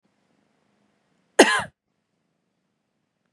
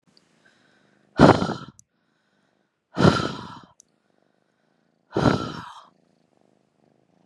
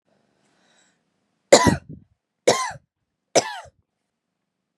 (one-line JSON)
{"cough_length": "3.3 s", "cough_amplitude": 32474, "cough_signal_mean_std_ratio": 0.17, "exhalation_length": "7.3 s", "exhalation_amplitude": 32427, "exhalation_signal_mean_std_ratio": 0.26, "three_cough_length": "4.8 s", "three_cough_amplitude": 32768, "three_cough_signal_mean_std_ratio": 0.24, "survey_phase": "beta (2021-08-13 to 2022-03-07)", "age": "18-44", "gender": "Female", "wearing_mask": "No", "symptom_none": true, "smoker_status": "Never smoked", "respiratory_condition_asthma": false, "respiratory_condition_other": false, "recruitment_source": "REACT", "submission_delay": "1 day", "covid_test_result": "Negative", "covid_test_method": "RT-qPCR", "influenza_a_test_result": "Negative", "influenza_b_test_result": "Negative"}